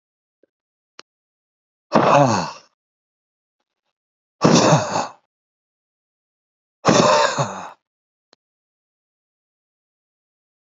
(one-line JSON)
{"exhalation_length": "10.7 s", "exhalation_amplitude": 28328, "exhalation_signal_mean_std_ratio": 0.32, "survey_phase": "beta (2021-08-13 to 2022-03-07)", "age": "45-64", "gender": "Male", "wearing_mask": "No", "symptom_cough_any": true, "symptom_runny_or_blocked_nose": true, "symptom_headache": true, "symptom_onset": "12 days", "smoker_status": "Ex-smoker", "respiratory_condition_asthma": true, "respiratory_condition_other": false, "recruitment_source": "REACT", "submission_delay": "1 day", "covid_test_result": "Negative", "covid_test_method": "RT-qPCR", "influenza_a_test_result": "Negative", "influenza_b_test_result": "Negative"}